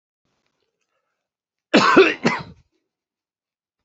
cough_length: 3.8 s
cough_amplitude: 29855
cough_signal_mean_std_ratio: 0.28
survey_phase: beta (2021-08-13 to 2022-03-07)
age: 45-64
gender: Male
wearing_mask: 'No'
symptom_cough_any: true
symptom_shortness_of_breath: true
symptom_headache: true
symptom_onset: 12 days
smoker_status: Never smoked
respiratory_condition_asthma: false
respiratory_condition_other: false
recruitment_source: REACT
submission_delay: 1 day
covid_test_result: Negative
covid_test_method: RT-qPCR
influenza_a_test_result: Negative
influenza_b_test_result: Negative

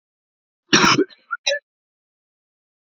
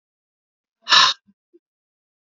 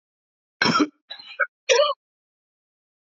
cough_length: 3.0 s
cough_amplitude: 32768
cough_signal_mean_std_ratio: 0.3
exhalation_length: 2.2 s
exhalation_amplitude: 29070
exhalation_signal_mean_std_ratio: 0.25
three_cough_length: 3.1 s
three_cough_amplitude: 17836
three_cough_signal_mean_std_ratio: 0.35
survey_phase: alpha (2021-03-01 to 2021-08-12)
age: 45-64
gender: Male
wearing_mask: 'No'
symptom_cough_any: true
smoker_status: Never smoked
respiratory_condition_asthma: false
respiratory_condition_other: false
recruitment_source: Test and Trace
submission_delay: 1 day
covid_test_result: Positive
covid_test_method: RT-qPCR
covid_ct_value: 19.2
covid_ct_gene: ORF1ab gene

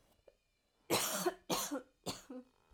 cough_length: 2.7 s
cough_amplitude: 3350
cough_signal_mean_std_ratio: 0.47
survey_phase: alpha (2021-03-01 to 2021-08-12)
age: 18-44
gender: Female
wearing_mask: 'No'
symptom_none: true
symptom_onset: 12 days
smoker_status: Never smoked
respiratory_condition_asthma: true
respiratory_condition_other: false
recruitment_source: REACT
submission_delay: 1 day
covid_test_result: Negative
covid_test_method: RT-qPCR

